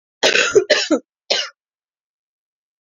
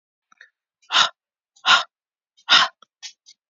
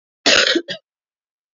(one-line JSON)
{"three_cough_length": "2.8 s", "three_cough_amplitude": 31791, "three_cough_signal_mean_std_ratio": 0.4, "exhalation_length": "3.5 s", "exhalation_amplitude": 27787, "exhalation_signal_mean_std_ratio": 0.3, "cough_length": "1.5 s", "cough_amplitude": 32149, "cough_signal_mean_std_ratio": 0.39, "survey_phase": "beta (2021-08-13 to 2022-03-07)", "age": "45-64", "gender": "Female", "wearing_mask": "No", "symptom_cough_any": true, "symptom_runny_or_blocked_nose": true, "symptom_abdominal_pain": true, "symptom_fatigue": true, "symptom_fever_high_temperature": true, "symptom_headache": true, "symptom_loss_of_taste": true, "symptom_onset": "3 days", "smoker_status": "Ex-smoker", "respiratory_condition_asthma": false, "respiratory_condition_other": false, "recruitment_source": "Test and Trace", "submission_delay": "2 days", "covid_test_result": "Positive", "covid_test_method": "RT-qPCR"}